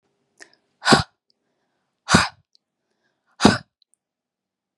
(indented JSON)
{
  "exhalation_length": "4.8 s",
  "exhalation_amplitude": 32768,
  "exhalation_signal_mean_std_ratio": 0.23,
  "survey_phase": "beta (2021-08-13 to 2022-03-07)",
  "age": "18-44",
  "gender": "Female",
  "wearing_mask": "No",
  "symptom_fatigue": true,
  "smoker_status": "Never smoked",
  "respiratory_condition_asthma": false,
  "respiratory_condition_other": false,
  "recruitment_source": "REACT",
  "submission_delay": "3 days",
  "covid_test_result": "Negative",
  "covid_test_method": "RT-qPCR",
  "influenza_a_test_result": "Negative",
  "influenza_b_test_result": "Negative"
}